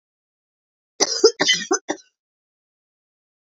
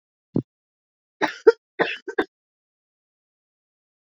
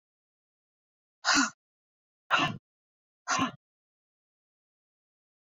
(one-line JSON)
{"cough_length": "3.6 s", "cough_amplitude": 27512, "cough_signal_mean_std_ratio": 0.28, "three_cough_length": "4.1 s", "three_cough_amplitude": 26352, "three_cough_signal_mean_std_ratio": 0.2, "exhalation_length": "5.5 s", "exhalation_amplitude": 9338, "exhalation_signal_mean_std_ratio": 0.27, "survey_phase": "beta (2021-08-13 to 2022-03-07)", "age": "45-64", "gender": "Female", "wearing_mask": "No", "symptom_cough_any": true, "symptom_runny_or_blocked_nose": true, "symptom_sore_throat": true, "symptom_fatigue": true, "symptom_fever_high_temperature": true, "symptom_headache": true, "symptom_change_to_sense_of_smell_or_taste": true, "symptom_other": true, "symptom_onset": "2 days", "smoker_status": "Ex-smoker", "respiratory_condition_asthma": false, "respiratory_condition_other": false, "recruitment_source": "Test and Trace", "submission_delay": "2 days", "covid_test_result": "Positive", "covid_test_method": "RT-qPCR"}